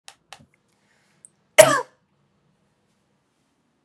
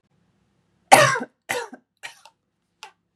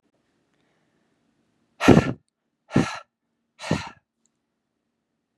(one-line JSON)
{"cough_length": "3.8 s", "cough_amplitude": 32768, "cough_signal_mean_std_ratio": 0.16, "three_cough_length": "3.2 s", "three_cough_amplitude": 32768, "three_cough_signal_mean_std_ratio": 0.25, "exhalation_length": "5.4 s", "exhalation_amplitude": 32768, "exhalation_signal_mean_std_ratio": 0.22, "survey_phase": "beta (2021-08-13 to 2022-03-07)", "age": "18-44", "gender": "Female", "wearing_mask": "No", "symptom_none": true, "smoker_status": "Never smoked", "respiratory_condition_asthma": false, "respiratory_condition_other": false, "recruitment_source": "Test and Trace", "submission_delay": "1 day", "covid_test_result": "Negative", "covid_test_method": "RT-qPCR"}